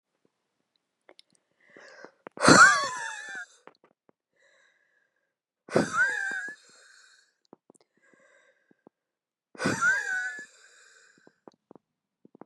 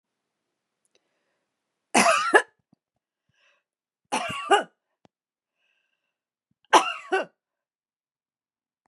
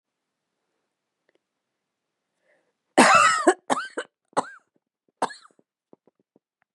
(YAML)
exhalation_length: 12.5 s
exhalation_amplitude: 26391
exhalation_signal_mean_std_ratio: 0.28
three_cough_length: 8.9 s
three_cough_amplitude: 27322
three_cough_signal_mean_std_ratio: 0.25
cough_length: 6.7 s
cough_amplitude: 26760
cough_signal_mean_std_ratio: 0.26
survey_phase: beta (2021-08-13 to 2022-03-07)
age: 65+
gender: Female
wearing_mask: 'No'
symptom_none: true
smoker_status: Never smoked
respiratory_condition_asthma: false
respiratory_condition_other: false
recruitment_source: REACT
submission_delay: 2 days
covid_test_result: Negative
covid_test_method: RT-qPCR
influenza_a_test_result: Negative
influenza_b_test_result: Negative